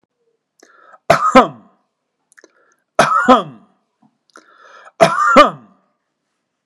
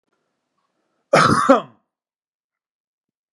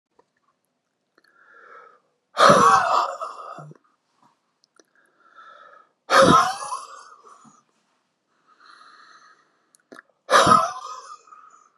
three_cough_length: 6.7 s
three_cough_amplitude: 32768
three_cough_signal_mean_std_ratio: 0.33
cough_length: 3.3 s
cough_amplitude: 32767
cough_signal_mean_std_ratio: 0.28
exhalation_length: 11.8 s
exhalation_amplitude: 32758
exhalation_signal_mean_std_ratio: 0.32
survey_phase: beta (2021-08-13 to 2022-03-07)
age: 45-64
gender: Male
wearing_mask: 'No'
symptom_runny_or_blocked_nose: true
smoker_status: Never smoked
respiratory_condition_asthma: false
respiratory_condition_other: false
recruitment_source: REACT
submission_delay: -1 day
covid_test_result: Negative
covid_test_method: RT-qPCR
influenza_a_test_result: Negative
influenza_b_test_result: Negative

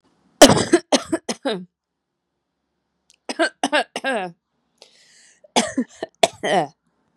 three_cough_length: 7.2 s
three_cough_amplitude: 32768
three_cough_signal_mean_std_ratio: 0.32
survey_phase: beta (2021-08-13 to 2022-03-07)
age: 18-44
gender: Female
wearing_mask: 'No'
symptom_sore_throat: true
symptom_fatigue: true
symptom_headache: true
symptom_change_to_sense_of_smell_or_taste: true
smoker_status: Ex-smoker
respiratory_condition_asthma: false
respiratory_condition_other: false
recruitment_source: Test and Trace
submission_delay: 1 day
covid_test_result: Positive
covid_test_method: LFT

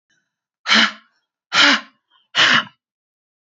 exhalation_length: 3.5 s
exhalation_amplitude: 32768
exhalation_signal_mean_std_ratio: 0.38
survey_phase: beta (2021-08-13 to 2022-03-07)
age: 45-64
gender: Female
wearing_mask: 'No'
symptom_none: true
smoker_status: Ex-smoker
respiratory_condition_asthma: false
respiratory_condition_other: false
recruitment_source: REACT
submission_delay: 1 day
covid_test_result: Negative
covid_test_method: RT-qPCR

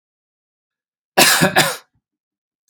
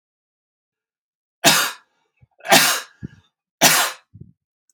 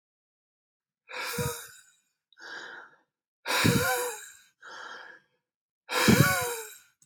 cough_length: 2.7 s
cough_amplitude: 32768
cough_signal_mean_std_ratio: 0.34
three_cough_length: 4.7 s
three_cough_amplitude: 32768
three_cough_signal_mean_std_ratio: 0.33
exhalation_length: 7.1 s
exhalation_amplitude: 14793
exhalation_signal_mean_std_ratio: 0.41
survey_phase: beta (2021-08-13 to 2022-03-07)
age: 18-44
gender: Male
wearing_mask: 'No'
symptom_runny_or_blocked_nose: true
smoker_status: Never smoked
respiratory_condition_asthma: false
respiratory_condition_other: false
recruitment_source: REACT
submission_delay: 1 day
covid_test_result: Negative
covid_test_method: RT-qPCR
influenza_a_test_result: Negative
influenza_b_test_result: Negative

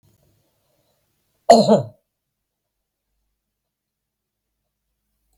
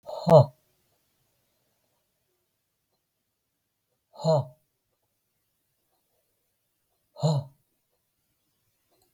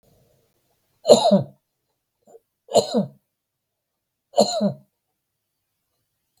cough_length: 5.4 s
cough_amplitude: 32768
cough_signal_mean_std_ratio: 0.18
exhalation_length: 9.1 s
exhalation_amplitude: 22346
exhalation_signal_mean_std_ratio: 0.19
three_cough_length: 6.4 s
three_cough_amplitude: 32768
three_cough_signal_mean_std_ratio: 0.28
survey_phase: beta (2021-08-13 to 2022-03-07)
age: 65+
gender: Male
wearing_mask: 'No'
symptom_cough_any: true
smoker_status: Never smoked
respiratory_condition_asthma: false
respiratory_condition_other: false
recruitment_source: REACT
submission_delay: 3 days
covid_test_result: Negative
covid_test_method: RT-qPCR
influenza_a_test_result: Negative
influenza_b_test_result: Negative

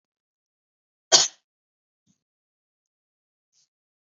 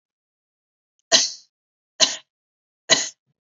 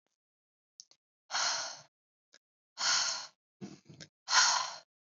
cough_length: 4.2 s
cough_amplitude: 32652
cough_signal_mean_std_ratio: 0.13
three_cough_length: 3.4 s
three_cough_amplitude: 32489
three_cough_signal_mean_std_ratio: 0.26
exhalation_length: 5.0 s
exhalation_amplitude: 8582
exhalation_signal_mean_std_ratio: 0.39
survey_phase: beta (2021-08-13 to 2022-03-07)
age: 18-44
gender: Female
wearing_mask: 'No'
symptom_runny_or_blocked_nose: true
symptom_onset: 3 days
smoker_status: Never smoked
respiratory_condition_asthma: false
respiratory_condition_other: false
recruitment_source: Test and Trace
submission_delay: 2 days
covid_test_result: Positive
covid_test_method: RT-qPCR
covid_ct_value: 26.2
covid_ct_gene: N gene
covid_ct_mean: 26.2
covid_viral_load: 2500 copies/ml
covid_viral_load_category: Minimal viral load (< 10K copies/ml)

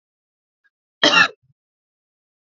cough_length: 2.5 s
cough_amplitude: 32404
cough_signal_mean_std_ratio: 0.24
survey_phase: alpha (2021-03-01 to 2021-08-12)
age: 18-44
gender: Female
wearing_mask: 'No'
symptom_none: true
symptom_onset: 6 days
smoker_status: Ex-smoker
respiratory_condition_asthma: false
respiratory_condition_other: false
recruitment_source: REACT
submission_delay: 1 day
covid_test_result: Negative
covid_test_method: RT-qPCR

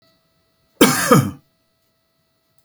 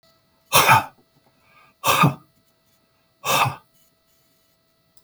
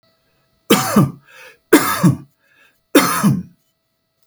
cough_length: 2.6 s
cough_amplitude: 32768
cough_signal_mean_std_ratio: 0.31
exhalation_length: 5.0 s
exhalation_amplitude: 29025
exhalation_signal_mean_std_ratio: 0.33
three_cough_length: 4.3 s
three_cough_amplitude: 32768
three_cough_signal_mean_std_ratio: 0.42
survey_phase: beta (2021-08-13 to 2022-03-07)
age: 45-64
gender: Male
wearing_mask: 'No'
symptom_none: true
smoker_status: Never smoked
respiratory_condition_asthma: false
respiratory_condition_other: false
recruitment_source: REACT
submission_delay: 1 day
covid_test_result: Negative
covid_test_method: RT-qPCR
influenza_a_test_result: Negative
influenza_b_test_result: Negative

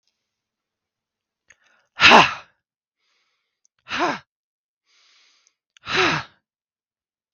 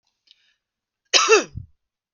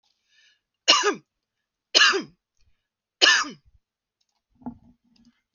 exhalation_length: 7.3 s
exhalation_amplitude: 32768
exhalation_signal_mean_std_ratio: 0.23
cough_length: 2.1 s
cough_amplitude: 32768
cough_signal_mean_std_ratio: 0.3
three_cough_length: 5.5 s
three_cough_amplitude: 31397
three_cough_signal_mean_std_ratio: 0.29
survey_phase: beta (2021-08-13 to 2022-03-07)
age: 18-44
gender: Female
wearing_mask: 'No'
symptom_cough_any: true
symptom_runny_or_blocked_nose: true
symptom_shortness_of_breath: true
symptom_sore_throat: true
symptom_abdominal_pain: true
symptom_fatigue: true
smoker_status: Ex-smoker
respiratory_condition_asthma: true
respiratory_condition_other: false
recruitment_source: REACT
submission_delay: 2 days
covid_test_result: Negative
covid_test_method: RT-qPCR
influenza_a_test_result: Negative
influenza_b_test_result: Negative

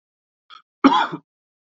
cough_length: 1.8 s
cough_amplitude: 27518
cough_signal_mean_std_ratio: 0.28
survey_phase: beta (2021-08-13 to 2022-03-07)
age: 45-64
gender: Male
wearing_mask: 'No'
symptom_cough_any: true
symptom_new_continuous_cough: true
symptom_runny_or_blocked_nose: true
symptom_sore_throat: true
symptom_fatigue: true
symptom_headache: true
symptom_change_to_sense_of_smell_or_taste: true
symptom_loss_of_taste: true
symptom_other: true
smoker_status: Ex-smoker
respiratory_condition_asthma: false
respiratory_condition_other: true
recruitment_source: Test and Trace
submission_delay: 0 days
covid_test_result: Positive
covid_test_method: LFT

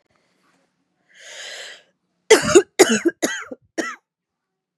cough_length: 4.8 s
cough_amplitude: 32767
cough_signal_mean_std_ratio: 0.29
survey_phase: beta (2021-08-13 to 2022-03-07)
age: 18-44
gender: Female
wearing_mask: 'No'
symptom_cough_any: true
symptom_runny_or_blocked_nose: true
symptom_shortness_of_breath: true
symptom_change_to_sense_of_smell_or_taste: true
symptom_loss_of_taste: true
symptom_onset: 2 days
smoker_status: Ex-smoker
respiratory_condition_asthma: false
respiratory_condition_other: false
recruitment_source: Test and Trace
submission_delay: 1 day
covid_test_result: Positive
covid_test_method: RT-qPCR
covid_ct_value: 21.0
covid_ct_gene: N gene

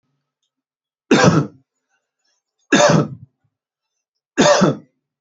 three_cough_length: 5.2 s
three_cough_amplitude: 29804
three_cough_signal_mean_std_ratio: 0.37
survey_phase: beta (2021-08-13 to 2022-03-07)
age: 45-64
gender: Male
wearing_mask: 'No'
symptom_cough_any: true
symptom_runny_or_blocked_nose: true
symptom_sore_throat: true
symptom_fatigue: true
symptom_other: true
smoker_status: Never smoked
respiratory_condition_asthma: false
respiratory_condition_other: false
recruitment_source: Test and Trace
submission_delay: 1 day
covid_test_result: Positive
covid_test_method: RT-qPCR
covid_ct_value: 20.3
covid_ct_gene: ORF1ab gene
covid_ct_mean: 20.8
covid_viral_load: 150000 copies/ml
covid_viral_load_category: Low viral load (10K-1M copies/ml)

